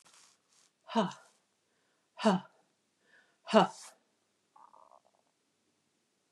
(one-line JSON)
{"exhalation_length": "6.3 s", "exhalation_amplitude": 13403, "exhalation_signal_mean_std_ratio": 0.22, "survey_phase": "beta (2021-08-13 to 2022-03-07)", "age": "45-64", "gender": "Female", "wearing_mask": "No", "symptom_none": true, "smoker_status": "Never smoked", "respiratory_condition_asthma": false, "respiratory_condition_other": false, "recruitment_source": "Test and Trace", "submission_delay": "-1 day", "covid_test_result": "Negative", "covid_test_method": "LFT"}